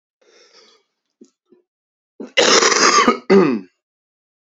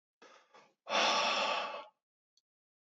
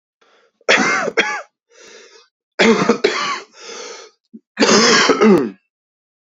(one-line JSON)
{"cough_length": "4.4 s", "cough_amplitude": 32767, "cough_signal_mean_std_ratio": 0.41, "exhalation_length": "2.8 s", "exhalation_amplitude": 4492, "exhalation_signal_mean_std_ratio": 0.48, "three_cough_length": "6.3 s", "three_cough_amplitude": 32108, "three_cough_signal_mean_std_ratio": 0.5, "survey_phase": "beta (2021-08-13 to 2022-03-07)", "age": "18-44", "gender": "Male", "wearing_mask": "No", "symptom_cough_any": true, "symptom_shortness_of_breath": true, "symptom_sore_throat": true, "symptom_diarrhoea": true, "symptom_fatigue": true, "smoker_status": "Never smoked", "respiratory_condition_asthma": false, "respiratory_condition_other": false, "recruitment_source": "Test and Trace", "submission_delay": "1 day", "covid_test_result": "Positive", "covid_test_method": "RT-qPCR"}